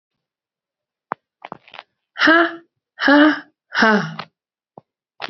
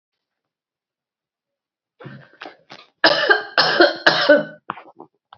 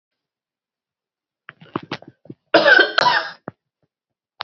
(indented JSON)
{
  "exhalation_length": "5.3 s",
  "exhalation_amplitude": 28995,
  "exhalation_signal_mean_std_ratio": 0.36,
  "three_cough_length": "5.4 s",
  "three_cough_amplitude": 32767,
  "three_cough_signal_mean_std_ratio": 0.36,
  "cough_length": "4.4 s",
  "cough_amplitude": 29711,
  "cough_signal_mean_std_ratio": 0.3,
  "survey_phase": "alpha (2021-03-01 to 2021-08-12)",
  "age": "18-44",
  "gender": "Female",
  "wearing_mask": "No",
  "symptom_cough_any": true,
  "symptom_new_continuous_cough": true,
  "symptom_shortness_of_breath": true,
  "symptom_diarrhoea": true,
  "symptom_fatigue": true,
  "symptom_headache": true,
  "symptom_change_to_sense_of_smell_or_taste": true,
  "symptom_loss_of_taste": true,
  "symptom_onset": "3 days",
  "smoker_status": "Never smoked",
  "respiratory_condition_asthma": false,
  "respiratory_condition_other": false,
  "recruitment_source": "Test and Trace",
  "submission_delay": "2 days",
  "covid_test_result": "Positive",
  "covid_test_method": "RT-qPCR",
  "covid_ct_value": 15.4,
  "covid_ct_gene": "ORF1ab gene",
  "covid_ct_mean": 16.5,
  "covid_viral_load": "4000000 copies/ml",
  "covid_viral_load_category": "High viral load (>1M copies/ml)"
}